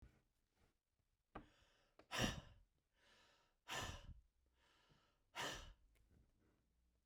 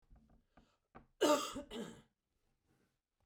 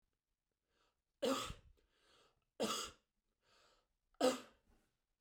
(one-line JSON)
{"exhalation_length": "7.1 s", "exhalation_amplitude": 1388, "exhalation_signal_mean_std_ratio": 0.33, "cough_length": "3.3 s", "cough_amplitude": 3107, "cough_signal_mean_std_ratio": 0.29, "three_cough_length": "5.2 s", "three_cough_amplitude": 3224, "three_cough_signal_mean_std_ratio": 0.29, "survey_phase": "beta (2021-08-13 to 2022-03-07)", "age": "65+", "gender": "Female", "wearing_mask": "No", "symptom_none": true, "smoker_status": "Ex-smoker", "respiratory_condition_asthma": false, "respiratory_condition_other": false, "recruitment_source": "REACT", "submission_delay": "1 day", "covid_test_result": "Negative", "covid_test_method": "RT-qPCR", "influenza_a_test_result": "Unknown/Void", "influenza_b_test_result": "Unknown/Void"}